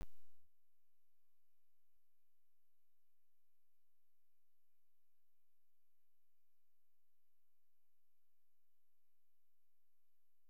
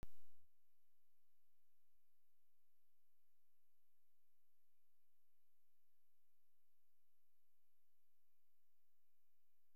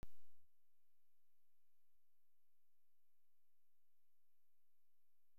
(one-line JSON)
{"exhalation_length": "10.5 s", "exhalation_amplitude": 298, "exhalation_signal_mean_std_ratio": 1.05, "three_cough_length": "9.8 s", "three_cough_amplitude": 301, "three_cough_signal_mean_std_ratio": 1.05, "cough_length": "5.4 s", "cough_amplitude": 290, "cough_signal_mean_std_ratio": 0.87, "survey_phase": "beta (2021-08-13 to 2022-03-07)", "age": "45-64", "gender": "Female", "wearing_mask": "No", "symptom_none": true, "smoker_status": "Never smoked", "respiratory_condition_asthma": false, "respiratory_condition_other": false, "recruitment_source": "REACT", "submission_delay": "2 days", "covid_test_result": "Negative", "covid_test_method": "RT-qPCR"}